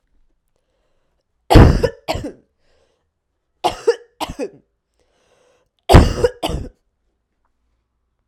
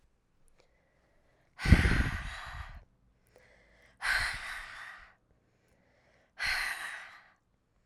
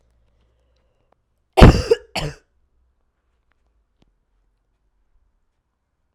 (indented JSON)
{
  "three_cough_length": "8.3 s",
  "three_cough_amplitude": 32768,
  "three_cough_signal_mean_std_ratio": 0.27,
  "exhalation_length": "7.9 s",
  "exhalation_amplitude": 17910,
  "exhalation_signal_mean_std_ratio": 0.34,
  "cough_length": "6.1 s",
  "cough_amplitude": 32768,
  "cough_signal_mean_std_ratio": 0.17,
  "survey_phase": "alpha (2021-03-01 to 2021-08-12)",
  "age": "18-44",
  "gender": "Female",
  "wearing_mask": "No",
  "symptom_cough_any": true,
  "symptom_new_continuous_cough": true,
  "symptom_shortness_of_breath": true,
  "symptom_fatigue": true,
  "symptom_headache": true,
  "smoker_status": "Never smoked",
  "respiratory_condition_asthma": false,
  "respiratory_condition_other": false,
  "recruitment_source": "Test and Trace",
  "submission_delay": "2 days",
  "covid_test_result": "Positive",
  "covid_test_method": "LFT"
}